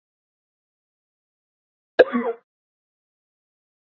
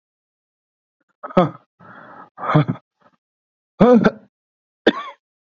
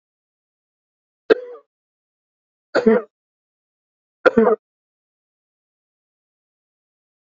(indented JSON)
{
  "cough_length": "3.9 s",
  "cough_amplitude": 26578,
  "cough_signal_mean_std_ratio": 0.16,
  "exhalation_length": "5.5 s",
  "exhalation_amplitude": 27298,
  "exhalation_signal_mean_std_ratio": 0.29,
  "three_cough_length": "7.3 s",
  "three_cough_amplitude": 29763,
  "three_cough_signal_mean_std_ratio": 0.21,
  "survey_phase": "beta (2021-08-13 to 2022-03-07)",
  "age": "18-44",
  "gender": "Male",
  "wearing_mask": "No",
  "symptom_cough_any": true,
  "symptom_runny_or_blocked_nose": true,
  "symptom_sore_throat": true,
  "symptom_fatigue": true,
  "symptom_fever_high_temperature": true,
  "smoker_status": "Never smoked",
  "respiratory_condition_asthma": false,
  "respiratory_condition_other": false,
  "recruitment_source": "Test and Trace",
  "submission_delay": "2 days",
  "covid_test_result": "Positive",
  "covid_test_method": "RT-qPCR",
  "covid_ct_value": 20.6,
  "covid_ct_gene": "ORF1ab gene",
  "covid_ct_mean": 20.9,
  "covid_viral_load": "140000 copies/ml",
  "covid_viral_load_category": "Low viral load (10K-1M copies/ml)"
}